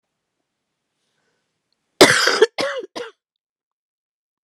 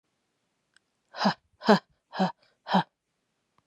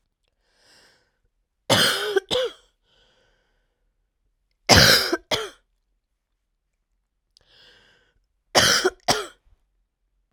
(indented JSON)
{
  "cough_length": "4.4 s",
  "cough_amplitude": 32768,
  "cough_signal_mean_std_ratio": 0.26,
  "exhalation_length": "3.7 s",
  "exhalation_amplitude": 19113,
  "exhalation_signal_mean_std_ratio": 0.27,
  "three_cough_length": "10.3 s",
  "three_cough_amplitude": 32768,
  "three_cough_signal_mean_std_ratio": 0.3,
  "survey_phase": "beta (2021-08-13 to 2022-03-07)",
  "age": "18-44",
  "gender": "Female",
  "wearing_mask": "No",
  "symptom_cough_any": true,
  "symptom_runny_or_blocked_nose": true,
  "symptom_shortness_of_breath": true,
  "symptom_fatigue": true,
  "symptom_headache": true,
  "symptom_change_to_sense_of_smell_or_taste": true,
  "symptom_loss_of_taste": true,
  "symptom_onset": "6 days",
  "smoker_status": "Never smoked",
  "respiratory_condition_asthma": false,
  "respiratory_condition_other": false,
  "recruitment_source": "Test and Trace",
  "submission_delay": "2 days",
  "covid_test_result": "Positive",
  "covid_test_method": "RT-qPCR",
  "covid_ct_value": 13.9,
  "covid_ct_gene": "ORF1ab gene",
  "covid_ct_mean": 14.4,
  "covid_viral_load": "20000000 copies/ml",
  "covid_viral_load_category": "High viral load (>1M copies/ml)"
}